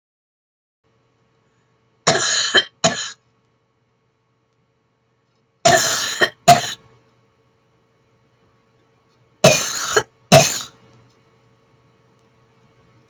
{"three_cough_length": "13.1 s", "three_cough_amplitude": 32768, "three_cough_signal_mean_std_ratio": 0.29, "survey_phase": "beta (2021-08-13 to 2022-03-07)", "age": "65+", "gender": "Female", "wearing_mask": "No", "symptom_none": true, "smoker_status": "Ex-smoker", "respiratory_condition_asthma": false, "respiratory_condition_other": true, "recruitment_source": "REACT", "submission_delay": "1 day", "covid_test_result": "Negative", "covid_test_method": "RT-qPCR", "influenza_a_test_result": "Negative", "influenza_b_test_result": "Negative"}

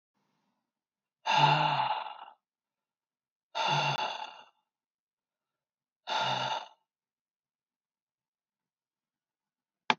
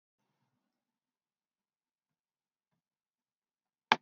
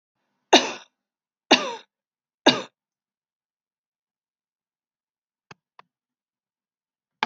{"exhalation_length": "10.0 s", "exhalation_amplitude": 14827, "exhalation_signal_mean_std_ratio": 0.35, "cough_length": "4.0 s", "cough_amplitude": 16828, "cough_signal_mean_std_ratio": 0.05, "three_cough_length": "7.3 s", "three_cough_amplitude": 29384, "three_cough_signal_mean_std_ratio": 0.17, "survey_phase": "beta (2021-08-13 to 2022-03-07)", "age": "65+", "gender": "Female", "wearing_mask": "No", "symptom_none": true, "symptom_onset": "5 days", "smoker_status": "Never smoked", "respiratory_condition_asthma": false, "respiratory_condition_other": false, "recruitment_source": "REACT", "submission_delay": "2 days", "covid_test_result": "Negative", "covid_test_method": "RT-qPCR", "influenza_a_test_result": "Negative", "influenza_b_test_result": "Negative"}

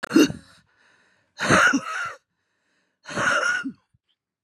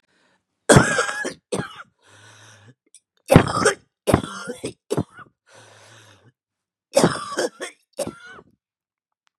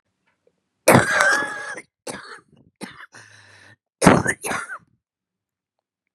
{"exhalation_length": "4.4 s", "exhalation_amplitude": 23336, "exhalation_signal_mean_std_ratio": 0.44, "three_cough_length": "9.4 s", "three_cough_amplitude": 32768, "three_cough_signal_mean_std_ratio": 0.31, "cough_length": "6.1 s", "cough_amplitude": 32768, "cough_signal_mean_std_ratio": 0.33, "survey_phase": "beta (2021-08-13 to 2022-03-07)", "age": "45-64", "gender": "Female", "wearing_mask": "No", "symptom_cough_any": true, "symptom_runny_or_blocked_nose": true, "symptom_shortness_of_breath": true, "symptom_abdominal_pain": true, "symptom_fatigue": true, "symptom_fever_high_temperature": true, "symptom_headache": true, "symptom_onset": "12 days", "smoker_status": "Current smoker (11 or more cigarettes per day)", "respiratory_condition_asthma": false, "respiratory_condition_other": true, "recruitment_source": "REACT", "submission_delay": "9 days", "covid_test_result": "Negative", "covid_test_method": "RT-qPCR", "influenza_a_test_result": "Negative", "influenza_b_test_result": "Negative"}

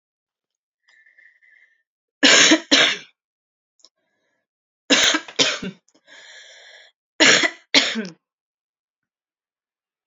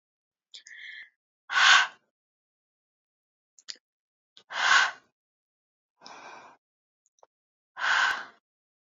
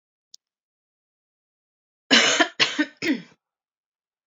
{"three_cough_length": "10.1 s", "three_cough_amplitude": 32768, "three_cough_signal_mean_std_ratio": 0.32, "exhalation_length": "8.9 s", "exhalation_amplitude": 15429, "exhalation_signal_mean_std_ratio": 0.28, "cough_length": "4.3 s", "cough_amplitude": 25535, "cough_signal_mean_std_ratio": 0.31, "survey_phase": "alpha (2021-03-01 to 2021-08-12)", "age": "18-44", "gender": "Female", "wearing_mask": "No", "symptom_cough_any": true, "symptom_new_continuous_cough": true, "symptom_shortness_of_breath": true, "symptom_abdominal_pain": true, "symptom_diarrhoea": true, "symptom_fatigue": true, "symptom_fever_high_temperature": true, "symptom_headache": true, "smoker_status": "Never smoked", "respiratory_condition_asthma": false, "respiratory_condition_other": false, "recruitment_source": "Test and Trace", "submission_delay": "1 day", "covid_test_result": "Positive", "covid_test_method": "RT-qPCR", "covid_ct_value": 23.6, "covid_ct_gene": "ORF1ab gene", "covid_ct_mean": 24.2, "covid_viral_load": "11000 copies/ml", "covid_viral_load_category": "Low viral load (10K-1M copies/ml)"}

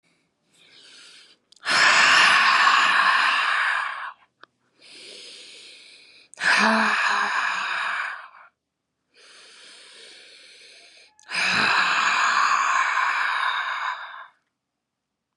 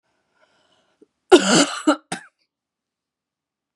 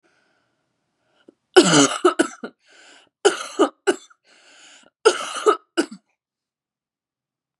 {"exhalation_length": "15.4 s", "exhalation_amplitude": 20869, "exhalation_signal_mean_std_ratio": 0.59, "cough_length": "3.8 s", "cough_amplitude": 32768, "cough_signal_mean_std_ratio": 0.26, "three_cough_length": "7.6 s", "three_cough_amplitude": 32768, "three_cough_signal_mean_std_ratio": 0.3, "survey_phase": "beta (2021-08-13 to 2022-03-07)", "age": "18-44", "gender": "Female", "wearing_mask": "Yes", "symptom_cough_any": true, "symptom_runny_or_blocked_nose": true, "symptom_sore_throat": true, "symptom_fever_high_temperature": true, "symptom_onset": "3 days", "smoker_status": "Ex-smoker", "respiratory_condition_asthma": false, "respiratory_condition_other": false, "recruitment_source": "Test and Trace", "submission_delay": "2 days", "covid_test_result": "Positive", "covid_test_method": "RT-qPCR", "covid_ct_value": 22.4, "covid_ct_gene": "ORF1ab gene", "covid_ct_mean": 22.8, "covid_viral_load": "32000 copies/ml", "covid_viral_load_category": "Low viral load (10K-1M copies/ml)"}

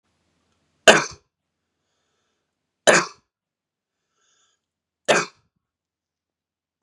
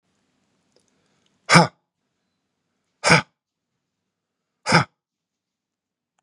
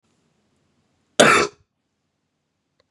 {"three_cough_length": "6.8 s", "three_cough_amplitude": 32768, "three_cough_signal_mean_std_ratio": 0.19, "exhalation_length": "6.2 s", "exhalation_amplitude": 32767, "exhalation_signal_mean_std_ratio": 0.21, "cough_length": "2.9 s", "cough_amplitude": 32551, "cough_signal_mean_std_ratio": 0.24, "survey_phase": "beta (2021-08-13 to 2022-03-07)", "age": "18-44", "gender": "Male", "wearing_mask": "No", "symptom_none": true, "smoker_status": "Ex-smoker", "respiratory_condition_asthma": false, "respiratory_condition_other": false, "recruitment_source": "REACT", "submission_delay": "1 day", "covid_test_result": "Negative", "covid_test_method": "RT-qPCR", "influenza_a_test_result": "Negative", "influenza_b_test_result": "Negative"}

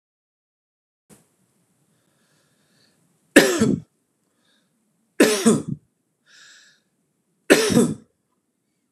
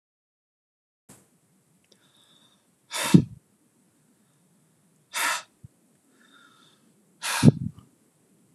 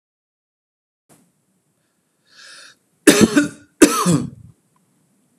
{"three_cough_length": "8.9 s", "three_cough_amplitude": 32768, "three_cough_signal_mean_std_ratio": 0.28, "exhalation_length": "8.5 s", "exhalation_amplitude": 31767, "exhalation_signal_mean_std_ratio": 0.2, "cough_length": "5.4 s", "cough_amplitude": 32768, "cough_signal_mean_std_ratio": 0.28, "survey_phase": "beta (2021-08-13 to 2022-03-07)", "age": "45-64", "gender": "Male", "wearing_mask": "No", "symptom_none": true, "smoker_status": "Never smoked", "respiratory_condition_asthma": false, "respiratory_condition_other": false, "recruitment_source": "REACT", "submission_delay": "1 day", "covid_test_result": "Negative", "covid_test_method": "RT-qPCR"}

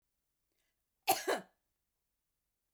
{"cough_length": "2.7 s", "cough_amplitude": 4996, "cough_signal_mean_std_ratio": 0.23, "survey_phase": "beta (2021-08-13 to 2022-03-07)", "age": "45-64", "gender": "Female", "wearing_mask": "No", "symptom_none": true, "smoker_status": "Never smoked", "respiratory_condition_asthma": false, "respiratory_condition_other": false, "recruitment_source": "REACT", "submission_delay": "1 day", "covid_test_result": "Negative", "covid_test_method": "RT-qPCR"}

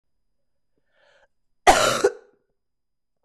{"cough_length": "3.2 s", "cough_amplitude": 23896, "cough_signal_mean_std_ratio": 0.26, "survey_phase": "beta (2021-08-13 to 2022-03-07)", "age": "45-64", "gender": "Female", "wearing_mask": "No", "symptom_cough_any": true, "symptom_runny_or_blocked_nose": true, "symptom_abdominal_pain": true, "symptom_diarrhoea": true, "symptom_fatigue": true, "symptom_fever_high_temperature": true, "symptom_change_to_sense_of_smell_or_taste": true, "symptom_onset": "3 days", "smoker_status": "Ex-smoker", "respiratory_condition_asthma": false, "respiratory_condition_other": false, "recruitment_source": "Test and Trace", "submission_delay": "2 days", "covid_test_result": "Positive", "covid_test_method": "RT-qPCR"}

